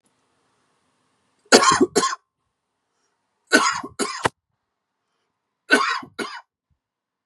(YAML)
three_cough_length: 7.3 s
three_cough_amplitude: 32768
three_cough_signal_mean_std_ratio: 0.31
survey_phase: beta (2021-08-13 to 2022-03-07)
age: 18-44
wearing_mask: 'No'
symptom_cough_any: true
symptom_runny_or_blocked_nose: true
symptom_sore_throat: true
symptom_fatigue: true
symptom_fever_high_temperature: true
symptom_headache: true
symptom_onset: 8 days
smoker_status: Never smoked
respiratory_condition_asthma: false
respiratory_condition_other: false
recruitment_source: Test and Trace
submission_delay: 6 days
covid_test_result: Positive
covid_test_method: RT-qPCR
covid_ct_value: 14.2
covid_ct_gene: N gene